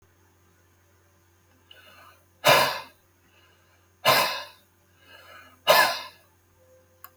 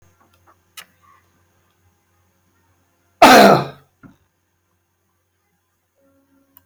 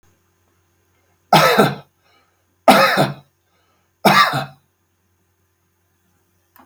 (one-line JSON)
{"exhalation_length": "7.2 s", "exhalation_amplitude": 24038, "exhalation_signal_mean_std_ratio": 0.3, "cough_length": "6.7 s", "cough_amplitude": 32768, "cough_signal_mean_std_ratio": 0.21, "three_cough_length": "6.7 s", "three_cough_amplitude": 32768, "three_cough_signal_mean_std_ratio": 0.34, "survey_phase": "beta (2021-08-13 to 2022-03-07)", "age": "65+", "gender": "Male", "wearing_mask": "No", "symptom_none": true, "smoker_status": "Ex-smoker", "respiratory_condition_asthma": false, "respiratory_condition_other": false, "recruitment_source": "REACT", "submission_delay": "5 days", "covid_test_result": "Negative", "covid_test_method": "RT-qPCR", "influenza_a_test_result": "Negative", "influenza_b_test_result": "Negative"}